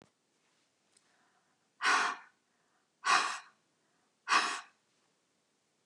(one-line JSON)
{"exhalation_length": "5.9 s", "exhalation_amplitude": 6967, "exhalation_signal_mean_std_ratio": 0.31, "survey_phase": "beta (2021-08-13 to 2022-03-07)", "age": "65+", "gender": "Female", "wearing_mask": "No", "symptom_none": true, "smoker_status": "Ex-smoker", "respiratory_condition_asthma": false, "respiratory_condition_other": false, "recruitment_source": "REACT", "submission_delay": "1 day", "covid_test_result": "Negative", "covid_test_method": "RT-qPCR", "influenza_a_test_result": "Negative", "influenza_b_test_result": "Negative"}